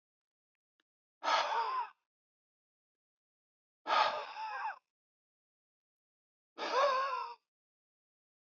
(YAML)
exhalation_length: 8.4 s
exhalation_amplitude: 4640
exhalation_signal_mean_std_ratio: 0.39
survey_phase: alpha (2021-03-01 to 2021-08-12)
age: 65+
gender: Male
wearing_mask: 'No'
symptom_none: true
smoker_status: Never smoked
respiratory_condition_asthma: false
respiratory_condition_other: false
recruitment_source: REACT
submission_delay: 1 day
covid_test_result: Negative
covid_test_method: RT-qPCR